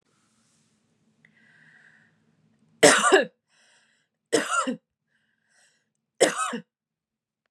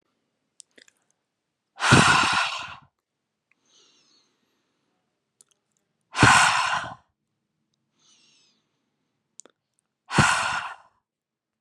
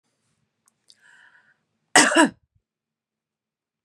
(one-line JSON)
{"three_cough_length": "7.5 s", "three_cough_amplitude": 25304, "three_cough_signal_mean_std_ratio": 0.27, "exhalation_length": "11.6 s", "exhalation_amplitude": 27888, "exhalation_signal_mean_std_ratio": 0.31, "cough_length": "3.8 s", "cough_amplitude": 32147, "cough_signal_mean_std_ratio": 0.22, "survey_phase": "beta (2021-08-13 to 2022-03-07)", "age": "18-44", "gender": "Female", "wearing_mask": "No", "symptom_none": true, "symptom_onset": "12 days", "smoker_status": "Never smoked", "respiratory_condition_asthma": false, "respiratory_condition_other": false, "recruitment_source": "REACT", "submission_delay": "1 day", "covid_test_result": "Negative", "covid_test_method": "RT-qPCR", "influenza_a_test_result": "Negative", "influenza_b_test_result": "Negative"}